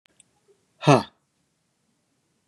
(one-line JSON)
{"exhalation_length": "2.5 s", "exhalation_amplitude": 22517, "exhalation_signal_mean_std_ratio": 0.2, "survey_phase": "beta (2021-08-13 to 2022-03-07)", "age": "45-64", "gender": "Male", "wearing_mask": "No", "symptom_none": true, "smoker_status": "Never smoked", "respiratory_condition_asthma": false, "respiratory_condition_other": false, "recruitment_source": "REACT", "submission_delay": "1 day", "covid_test_result": "Negative", "covid_test_method": "RT-qPCR", "influenza_a_test_result": "Negative", "influenza_b_test_result": "Negative"}